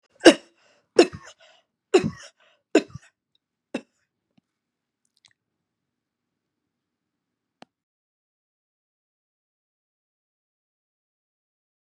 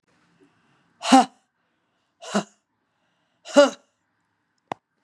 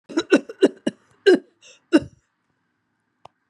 {
  "three_cough_length": "11.9 s",
  "three_cough_amplitude": 32768,
  "three_cough_signal_mean_std_ratio": 0.13,
  "exhalation_length": "5.0 s",
  "exhalation_amplitude": 32388,
  "exhalation_signal_mean_std_ratio": 0.22,
  "cough_length": "3.5 s",
  "cough_amplitude": 25126,
  "cough_signal_mean_std_ratio": 0.28,
  "survey_phase": "beta (2021-08-13 to 2022-03-07)",
  "age": "65+",
  "gender": "Female",
  "wearing_mask": "No",
  "symptom_none": true,
  "smoker_status": "Never smoked",
  "respiratory_condition_asthma": false,
  "respiratory_condition_other": false,
  "recruitment_source": "REACT",
  "submission_delay": "4 days",
  "covid_test_result": "Negative",
  "covid_test_method": "RT-qPCR",
  "influenza_a_test_result": "Negative",
  "influenza_b_test_result": "Negative"
}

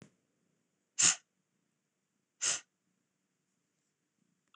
{
  "exhalation_length": "4.6 s",
  "exhalation_amplitude": 8764,
  "exhalation_signal_mean_std_ratio": 0.2,
  "survey_phase": "beta (2021-08-13 to 2022-03-07)",
  "age": "45-64",
  "gender": "Female",
  "wearing_mask": "No",
  "symptom_fatigue": true,
  "symptom_headache": true,
  "symptom_onset": "12 days",
  "smoker_status": "Ex-smoker",
  "respiratory_condition_asthma": false,
  "respiratory_condition_other": false,
  "recruitment_source": "REACT",
  "submission_delay": "3 days",
  "covid_test_result": "Negative",
  "covid_test_method": "RT-qPCR",
  "influenza_a_test_result": "Negative",
  "influenza_b_test_result": "Negative"
}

